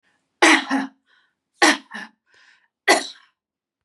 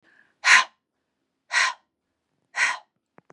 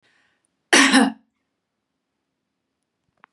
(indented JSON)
{
  "three_cough_length": "3.8 s",
  "three_cough_amplitude": 32174,
  "three_cough_signal_mean_std_ratio": 0.33,
  "exhalation_length": "3.3 s",
  "exhalation_amplitude": 27326,
  "exhalation_signal_mean_std_ratio": 0.31,
  "cough_length": "3.3 s",
  "cough_amplitude": 30990,
  "cough_signal_mean_std_ratio": 0.26,
  "survey_phase": "beta (2021-08-13 to 2022-03-07)",
  "age": "45-64",
  "gender": "Female",
  "wearing_mask": "No",
  "symptom_none": true,
  "smoker_status": "Ex-smoker",
  "respiratory_condition_asthma": false,
  "respiratory_condition_other": false,
  "recruitment_source": "REACT",
  "submission_delay": "1 day",
  "covid_test_result": "Negative",
  "covid_test_method": "RT-qPCR",
  "influenza_a_test_result": "Negative",
  "influenza_b_test_result": "Negative"
}